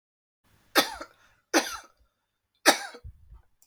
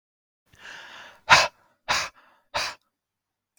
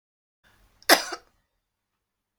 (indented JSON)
{
  "three_cough_length": "3.7 s",
  "three_cough_amplitude": 20924,
  "three_cough_signal_mean_std_ratio": 0.26,
  "exhalation_length": "3.6 s",
  "exhalation_amplitude": 31978,
  "exhalation_signal_mean_std_ratio": 0.27,
  "cough_length": "2.4 s",
  "cough_amplitude": 29633,
  "cough_signal_mean_std_ratio": 0.18,
  "survey_phase": "beta (2021-08-13 to 2022-03-07)",
  "age": "45-64",
  "gender": "Female",
  "wearing_mask": "No",
  "symptom_none": true,
  "smoker_status": "Never smoked",
  "respiratory_condition_asthma": false,
  "respiratory_condition_other": false,
  "recruitment_source": "REACT",
  "submission_delay": "1 day",
  "covid_test_result": "Negative",
  "covid_test_method": "RT-qPCR",
  "influenza_a_test_result": "Negative",
  "influenza_b_test_result": "Negative"
}